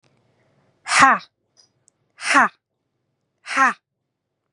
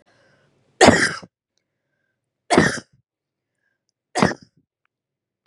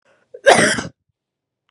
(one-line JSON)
{"exhalation_length": "4.5 s", "exhalation_amplitude": 32759, "exhalation_signal_mean_std_ratio": 0.3, "three_cough_length": "5.5 s", "three_cough_amplitude": 32768, "three_cough_signal_mean_std_ratio": 0.26, "cough_length": "1.7 s", "cough_amplitude": 32768, "cough_signal_mean_std_ratio": 0.34, "survey_phase": "beta (2021-08-13 to 2022-03-07)", "age": "18-44", "gender": "Female", "wearing_mask": "No", "symptom_none": true, "smoker_status": "Never smoked", "respiratory_condition_asthma": false, "respiratory_condition_other": false, "recruitment_source": "REACT", "submission_delay": "1 day", "covid_test_result": "Negative", "covid_test_method": "RT-qPCR", "influenza_a_test_result": "Negative", "influenza_b_test_result": "Negative"}